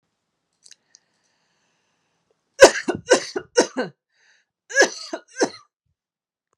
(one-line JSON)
{"cough_length": "6.6 s", "cough_amplitude": 32768, "cough_signal_mean_std_ratio": 0.23, "survey_phase": "beta (2021-08-13 to 2022-03-07)", "age": "18-44", "gender": "Female", "wearing_mask": "No", "symptom_runny_or_blocked_nose": true, "symptom_sore_throat": true, "smoker_status": "Never smoked", "respiratory_condition_asthma": false, "respiratory_condition_other": false, "recruitment_source": "Test and Trace", "submission_delay": "1 day", "covid_test_result": "Negative", "covid_test_method": "ePCR"}